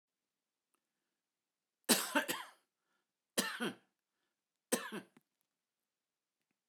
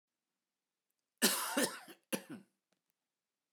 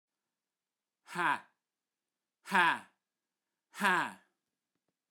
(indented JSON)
{
  "three_cough_length": "6.7 s",
  "three_cough_amplitude": 6810,
  "three_cough_signal_mean_std_ratio": 0.26,
  "cough_length": "3.5 s",
  "cough_amplitude": 6181,
  "cough_signal_mean_std_ratio": 0.31,
  "exhalation_length": "5.1 s",
  "exhalation_amplitude": 7803,
  "exhalation_signal_mean_std_ratio": 0.29,
  "survey_phase": "beta (2021-08-13 to 2022-03-07)",
  "age": "45-64",
  "gender": "Male",
  "wearing_mask": "No",
  "symptom_none": true,
  "smoker_status": "Never smoked",
  "respiratory_condition_asthma": false,
  "respiratory_condition_other": false,
  "recruitment_source": "REACT",
  "submission_delay": "2 days",
  "covid_test_result": "Negative",
  "covid_test_method": "RT-qPCR",
  "influenza_a_test_result": "Negative",
  "influenza_b_test_result": "Negative"
}